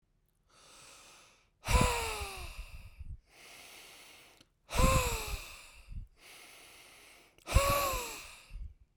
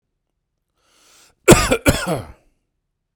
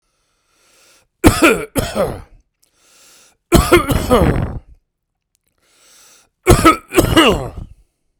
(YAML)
exhalation_length: 9.0 s
exhalation_amplitude: 9030
exhalation_signal_mean_std_ratio: 0.42
cough_length: 3.2 s
cough_amplitude: 32768
cough_signal_mean_std_ratio: 0.29
three_cough_length: 8.2 s
three_cough_amplitude: 32768
three_cough_signal_mean_std_ratio: 0.41
survey_phase: beta (2021-08-13 to 2022-03-07)
age: 45-64
gender: Male
wearing_mask: 'No'
symptom_none: true
smoker_status: Ex-smoker
respiratory_condition_asthma: true
respiratory_condition_other: false
recruitment_source: REACT
submission_delay: 3 days
covid_test_result: Negative
covid_test_method: RT-qPCR